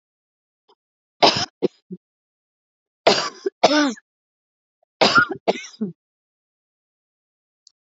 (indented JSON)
{
  "three_cough_length": "7.9 s",
  "three_cough_amplitude": 28891,
  "three_cough_signal_mean_std_ratio": 0.29,
  "survey_phase": "beta (2021-08-13 to 2022-03-07)",
  "age": "45-64",
  "gender": "Female",
  "wearing_mask": "No",
  "symptom_runny_or_blocked_nose": true,
  "symptom_shortness_of_breath": true,
  "symptom_fatigue": true,
  "smoker_status": "Never smoked",
  "respiratory_condition_asthma": true,
  "respiratory_condition_other": false,
  "recruitment_source": "REACT",
  "submission_delay": "3 days",
  "covid_test_result": "Negative",
  "covid_test_method": "RT-qPCR",
  "influenza_a_test_result": "Negative",
  "influenza_b_test_result": "Negative"
}